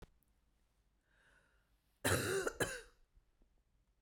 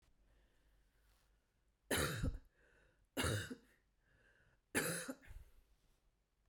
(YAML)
cough_length: 4.0 s
cough_amplitude: 3160
cough_signal_mean_std_ratio: 0.34
three_cough_length: 6.5 s
three_cough_amplitude: 2365
three_cough_signal_mean_std_ratio: 0.38
survey_phase: beta (2021-08-13 to 2022-03-07)
age: 45-64
gender: Female
wearing_mask: 'No'
symptom_none: true
smoker_status: Ex-smoker
respiratory_condition_asthma: false
respiratory_condition_other: false
recruitment_source: REACT
submission_delay: 1 day
covid_test_result: Negative
covid_test_method: RT-qPCR
influenza_a_test_result: Negative
influenza_b_test_result: Negative